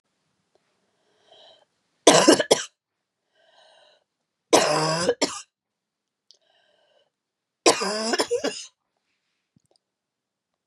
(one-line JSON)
{"three_cough_length": "10.7 s", "three_cough_amplitude": 32258, "three_cough_signal_mean_std_ratio": 0.29, "survey_phase": "beta (2021-08-13 to 2022-03-07)", "age": "45-64", "gender": "Female", "wearing_mask": "No", "symptom_cough_any": true, "symptom_runny_or_blocked_nose": true, "symptom_shortness_of_breath": true, "symptom_sore_throat": true, "symptom_fatigue": true, "symptom_fever_high_temperature": true, "symptom_headache": true, "smoker_status": "Never smoked", "respiratory_condition_asthma": false, "respiratory_condition_other": false, "recruitment_source": "Test and Trace", "submission_delay": "1 day", "covid_test_result": "Positive", "covid_test_method": "ePCR"}